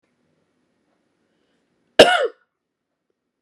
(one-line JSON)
{"cough_length": "3.4 s", "cough_amplitude": 32768, "cough_signal_mean_std_ratio": 0.19, "survey_phase": "beta (2021-08-13 to 2022-03-07)", "age": "45-64", "gender": "Female", "wearing_mask": "No", "symptom_runny_or_blocked_nose": true, "symptom_sore_throat": true, "symptom_fatigue": true, "symptom_headache": true, "smoker_status": "Never smoked", "respiratory_condition_asthma": false, "respiratory_condition_other": false, "recruitment_source": "REACT", "submission_delay": "1 day", "covid_test_result": "Positive", "covid_test_method": "RT-qPCR", "covid_ct_value": 19.0, "covid_ct_gene": "E gene", "influenza_a_test_result": "Negative", "influenza_b_test_result": "Negative"}